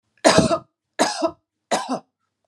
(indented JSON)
{
  "three_cough_length": "2.5 s",
  "three_cough_amplitude": 32281,
  "three_cough_signal_mean_std_ratio": 0.42,
  "survey_phase": "alpha (2021-03-01 to 2021-08-12)",
  "age": "45-64",
  "gender": "Female",
  "wearing_mask": "No",
  "symptom_none": true,
  "symptom_onset": "6 days",
  "smoker_status": "Never smoked",
  "respiratory_condition_asthma": false,
  "respiratory_condition_other": false,
  "recruitment_source": "REACT",
  "submission_delay": "1 day",
  "covid_test_result": "Negative",
  "covid_test_method": "RT-qPCR"
}